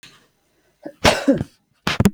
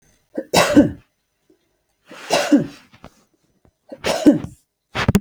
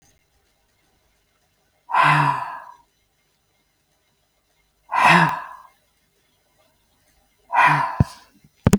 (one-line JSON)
{"cough_length": "2.1 s", "cough_amplitude": 32768, "cough_signal_mean_std_ratio": 0.36, "three_cough_length": "5.2 s", "three_cough_amplitude": 32768, "three_cough_signal_mean_std_ratio": 0.37, "exhalation_length": "8.8 s", "exhalation_amplitude": 32766, "exhalation_signal_mean_std_ratio": 0.33, "survey_phase": "beta (2021-08-13 to 2022-03-07)", "age": "45-64", "gender": "Female", "wearing_mask": "No", "symptom_none": true, "smoker_status": "Ex-smoker", "respiratory_condition_asthma": false, "respiratory_condition_other": false, "recruitment_source": "REACT", "submission_delay": "1 day", "covid_test_result": "Negative", "covid_test_method": "RT-qPCR", "influenza_a_test_result": "Negative", "influenza_b_test_result": "Negative"}